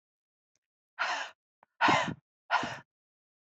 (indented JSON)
{
  "exhalation_length": "3.4 s",
  "exhalation_amplitude": 8820,
  "exhalation_signal_mean_std_ratio": 0.36,
  "survey_phase": "beta (2021-08-13 to 2022-03-07)",
  "age": "18-44",
  "gender": "Female",
  "wearing_mask": "No",
  "symptom_cough_any": true,
  "symptom_onset": "2 days",
  "smoker_status": "Never smoked",
  "respiratory_condition_asthma": false,
  "respiratory_condition_other": false,
  "recruitment_source": "REACT",
  "submission_delay": "2 days",
  "covid_test_result": "Negative",
  "covid_test_method": "RT-qPCR"
}